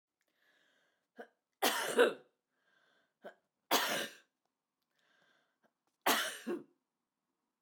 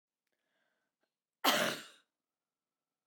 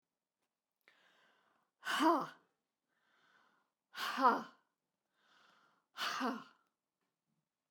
{"three_cough_length": "7.6 s", "three_cough_amplitude": 5363, "three_cough_signal_mean_std_ratio": 0.3, "cough_length": "3.1 s", "cough_amplitude": 6664, "cough_signal_mean_std_ratio": 0.25, "exhalation_length": "7.7 s", "exhalation_amplitude": 5328, "exhalation_signal_mean_std_ratio": 0.29, "survey_phase": "beta (2021-08-13 to 2022-03-07)", "age": "45-64", "gender": "Female", "wearing_mask": "No", "symptom_none": true, "smoker_status": "Ex-smoker", "respiratory_condition_asthma": false, "respiratory_condition_other": false, "recruitment_source": "REACT", "submission_delay": "1 day", "covid_test_result": "Negative", "covid_test_method": "RT-qPCR", "influenza_a_test_result": "Negative", "influenza_b_test_result": "Negative"}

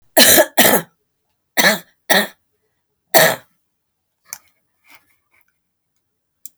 {"three_cough_length": "6.6 s", "three_cough_amplitude": 32768, "three_cough_signal_mean_std_ratio": 0.32, "survey_phase": "beta (2021-08-13 to 2022-03-07)", "age": "65+", "gender": "Female", "wearing_mask": "No", "symptom_none": true, "symptom_onset": "13 days", "smoker_status": "Ex-smoker", "respiratory_condition_asthma": false, "respiratory_condition_other": false, "recruitment_source": "REACT", "submission_delay": "1 day", "covid_test_result": "Negative", "covid_test_method": "RT-qPCR"}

